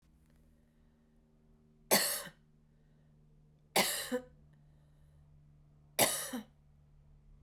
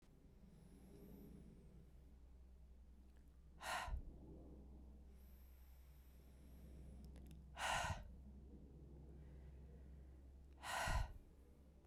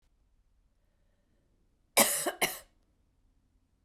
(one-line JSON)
{"three_cough_length": "7.4 s", "three_cough_amplitude": 7695, "three_cough_signal_mean_std_ratio": 0.31, "exhalation_length": "11.9 s", "exhalation_amplitude": 1109, "exhalation_signal_mean_std_ratio": 0.61, "cough_length": "3.8 s", "cough_amplitude": 11533, "cough_signal_mean_std_ratio": 0.25, "survey_phase": "beta (2021-08-13 to 2022-03-07)", "age": "18-44", "gender": "Female", "wearing_mask": "No", "symptom_cough_any": true, "symptom_runny_or_blocked_nose": true, "symptom_shortness_of_breath": true, "symptom_fatigue": true, "symptom_fever_high_temperature": true, "symptom_headache": true, "symptom_change_to_sense_of_smell_or_taste": true, "symptom_loss_of_taste": true, "symptom_onset": "2 days", "smoker_status": "Ex-smoker", "respiratory_condition_asthma": false, "respiratory_condition_other": false, "recruitment_source": "Test and Trace", "submission_delay": "1 day", "covid_test_result": "Positive", "covid_test_method": "RT-qPCR", "covid_ct_value": 15.8, "covid_ct_gene": "ORF1ab gene", "covid_ct_mean": 16.2, "covid_viral_load": "4900000 copies/ml", "covid_viral_load_category": "High viral load (>1M copies/ml)"}